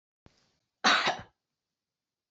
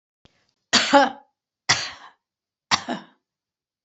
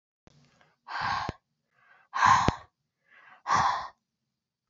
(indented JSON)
{
  "cough_length": "2.3 s",
  "cough_amplitude": 9695,
  "cough_signal_mean_std_ratio": 0.29,
  "three_cough_length": "3.8 s",
  "three_cough_amplitude": 29270,
  "three_cough_signal_mean_std_ratio": 0.3,
  "exhalation_length": "4.7 s",
  "exhalation_amplitude": 21386,
  "exhalation_signal_mean_std_ratio": 0.37,
  "survey_phase": "beta (2021-08-13 to 2022-03-07)",
  "age": "65+",
  "gender": "Female",
  "wearing_mask": "No",
  "symptom_none": true,
  "smoker_status": "Never smoked",
  "respiratory_condition_asthma": false,
  "respiratory_condition_other": false,
  "recruitment_source": "REACT",
  "submission_delay": "1 day",
  "covid_test_result": "Negative",
  "covid_test_method": "RT-qPCR"
}